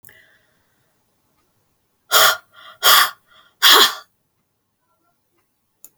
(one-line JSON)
{"exhalation_length": "6.0 s", "exhalation_amplitude": 32768, "exhalation_signal_mean_std_ratio": 0.29, "survey_phase": "beta (2021-08-13 to 2022-03-07)", "age": "65+", "gender": "Female", "wearing_mask": "No", "symptom_cough_any": true, "smoker_status": "Never smoked", "respiratory_condition_asthma": false, "respiratory_condition_other": false, "recruitment_source": "REACT", "submission_delay": "3 days", "covid_test_result": "Negative", "covid_test_method": "RT-qPCR"}